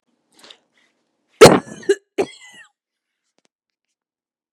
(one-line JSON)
{"cough_length": "4.5 s", "cough_amplitude": 32768, "cough_signal_mean_std_ratio": 0.19, "survey_phase": "beta (2021-08-13 to 2022-03-07)", "age": "18-44", "gender": "Female", "wearing_mask": "No", "symptom_none": true, "smoker_status": "Current smoker (1 to 10 cigarettes per day)", "respiratory_condition_asthma": false, "respiratory_condition_other": false, "recruitment_source": "REACT", "submission_delay": "2 days", "covid_test_result": "Negative", "covid_test_method": "RT-qPCR", "influenza_a_test_result": "Negative", "influenza_b_test_result": "Negative"}